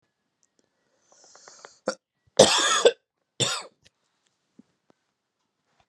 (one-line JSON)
{"three_cough_length": "5.9 s", "three_cough_amplitude": 31773, "three_cough_signal_mean_std_ratio": 0.25, "survey_phase": "beta (2021-08-13 to 2022-03-07)", "age": "18-44", "gender": "Male", "wearing_mask": "No", "symptom_none": true, "smoker_status": "Ex-smoker", "respiratory_condition_asthma": false, "respiratory_condition_other": false, "recruitment_source": "REACT", "submission_delay": "4 days", "covid_test_result": "Negative", "covid_test_method": "RT-qPCR"}